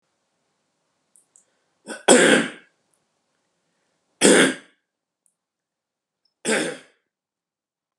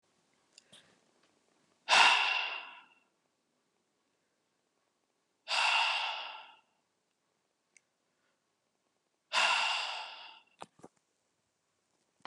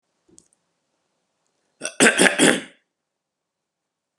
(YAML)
three_cough_length: 8.0 s
three_cough_amplitude: 32399
three_cough_signal_mean_std_ratio: 0.27
exhalation_length: 12.3 s
exhalation_amplitude: 9971
exhalation_signal_mean_std_ratio: 0.32
cough_length: 4.2 s
cough_amplitude: 32767
cough_signal_mean_std_ratio: 0.28
survey_phase: beta (2021-08-13 to 2022-03-07)
age: 18-44
gender: Male
wearing_mask: 'No'
symptom_none: true
smoker_status: Never smoked
respiratory_condition_asthma: true
respiratory_condition_other: false
recruitment_source: REACT
submission_delay: 2 days
covid_test_result: Negative
covid_test_method: RT-qPCR
influenza_a_test_result: Negative
influenza_b_test_result: Negative